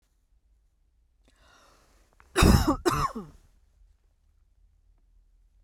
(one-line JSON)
{"cough_length": "5.6 s", "cough_amplitude": 16434, "cough_signal_mean_std_ratio": 0.27, "survey_phase": "beta (2021-08-13 to 2022-03-07)", "age": "45-64", "gender": "Female", "wearing_mask": "No", "symptom_cough_any": true, "symptom_runny_or_blocked_nose": true, "symptom_sore_throat": true, "symptom_fatigue": true, "symptom_fever_high_temperature": true, "symptom_onset": "3 days", "smoker_status": "Never smoked", "respiratory_condition_asthma": true, "respiratory_condition_other": false, "recruitment_source": "Test and Trace", "submission_delay": "2 days", "covid_test_result": "Positive", "covid_test_method": "RT-qPCR", "covid_ct_value": 21.5, "covid_ct_gene": "ORF1ab gene"}